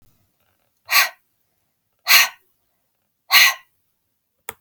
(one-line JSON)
{"exhalation_length": "4.6 s", "exhalation_amplitude": 32768, "exhalation_signal_mean_std_ratio": 0.28, "survey_phase": "alpha (2021-03-01 to 2021-08-12)", "age": "18-44", "gender": "Female", "wearing_mask": "No", "symptom_fatigue": true, "symptom_onset": "13 days", "smoker_status": "Ex-smoker", "respiratory_condition_asthma": false, "respiratory_condition_other": false, "recruitment_source": "REACT", "submission_delay": "2 days", "covid_test_result": "Negative", "covid_test_method": "RT-qPCR"}